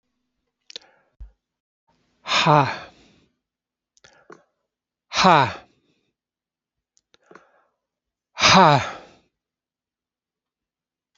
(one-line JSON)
{"exhalation_length": "11.2 s", "exhalation_amplitude": 31723, "exhalation_signal_mean_std_ratio": 0.25, "survey_phase": "beta (2021-08-13 to 2022-03-07)", "age": "65+", "gender": "Male", "wearing_mask": "No", "symptom_cough_any": true, "symptom_runny_or_blocked_nose": true, "symptom_fatigue": true, "symptom_change_to_sense_of_smell_or_taste": true, "symptom_other": true, "smoker_status": "Never smoked", "respiratory_condition_asthma": false, "respiratory_condition_other": false, "recruitment_source": "Test and Trace", "submission_delay": "1 day", "covid_test_result": "Positive", "covid_test_method": "RT-qPCR", "covid_ct_value": 24.8, "covid_ct_gene": "ORF1ab gene", "covid_ct_mean": 25.1, "covid_viral_load": "6000 copies/ml", "covid_viral_load_category": "Minimal viral load (< 10K copies/ml)"}